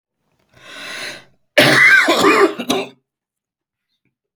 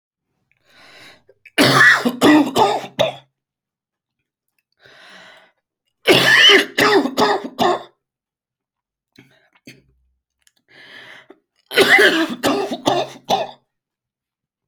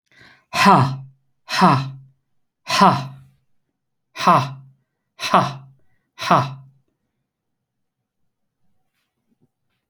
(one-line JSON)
{"cough_length": "4.4 s", "cough_amplitude": 31057, "cough_signal_mean_std_ratio": 0.45, "three_cough_length": "14.7 s", "three_cough_amplitude": 32768, "three_cough_signal_mean_std_ratio": 0.41, "exhalation_length": "9.9 s", "exhalation_amplitude": 29095, "exhalation_signal_mean_std_ratio": 0.34, "survey_phase": "beta (2021-08-13 to 2022-03-07)", "age": "45-64", "gender": "Male", "wearing_mask": "No", "symptom_cough_any": true, "symptom_sore_throat": true, "symptom_onset": "12 days", "smoker_status": "Never smoked", "respiratory_condition_asthma": true, "respiratory_condition_other": false, "recruitment_source": "REACT", "submission_delay": "1 day", "covid_test_result": "Negative", "covid_test_method": "RT-qPCR"}